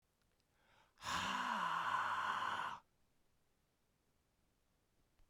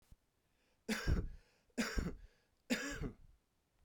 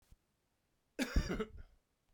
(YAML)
exhalation_length: 5.3 s
exhalation_amplitude: 1347
exhalation_signal_mean_std_ratio: 0.52
three_cough_length: 3.8 s
three_cough_amplitude: 2508
three_cough_signal_mean_std_ratio: 0.45
cough_length: 2.1 s
cough_amplitude: 3465
cough_signal_mean_std_ratio: 0.34
survey_phase: beta (2021-08-13 to 2022-03-07)
age: 45-64
gender: Male
wearing_mask: 'No'
symptom_cough_any: true
symptom_runny_or_blocked_nose: true
symptom_fatigue: true
symptom_headache: true
symptom_change_to_sense_of_smell_or_taste: true
symptom_loss_of_taste: true
symptom_onset: 6 days
smoker_status: Ex-smoker
respiratory_condition_asthma: false
respiratory_condition_other: false
recruitment_source: Test and Trace
submission_delay: 2 days
covid_test_result: Positive
covid_test_method: RT-qPCR
covid_ct_value: 15.6
covid_ct_gene: N gene
covid_ct_mean: 15.9
covid_viral_load: 6000000 copies/ml
covid_viral_load_category: High viral load (>1M copies/ml)